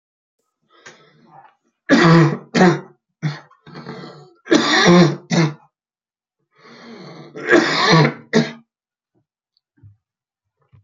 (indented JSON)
{
  "three_cough_length": "10.8 s",
  "three_cough_amplitude": 31265,
  "three_cough_signal_mean_std_ratio": 0.4,
  "survey_phase": "beta (2021-08-13 to 2022-03-07)",
  "age": "45-64",
  "gender": "Male",
  "wearing_mask": "No",
  "symptom_cough_any": true,
  "symptom_runny_or_blocked_nose": true,
  "symptom_shortness_of_breath": true,
  "symptom_sore_throat": true,
  "symptom_abdominal_pain": true,
  "symptom_diarrhoea": true,
  "symptom_fatigue": true,
  "symptom_fever_high_temperature": true,
  "symptom_headache": true,
  "symptom_onset": "12 days",
  "smoker_status": "Current smoker (1 to 10 cigarettes per day)",
  "respiratory_condition_asthma": true,
  "respiratory_condition_other": true,
  "recruitment_source": "REACT",
  "submission_delay": "2 days",
  "covid_test_result": "Negative",
  "covid_test_method": "RT-qPCR",
  "influenza_a_test_result": "Negative",
  "influenza_b_test_result": "Negative"
}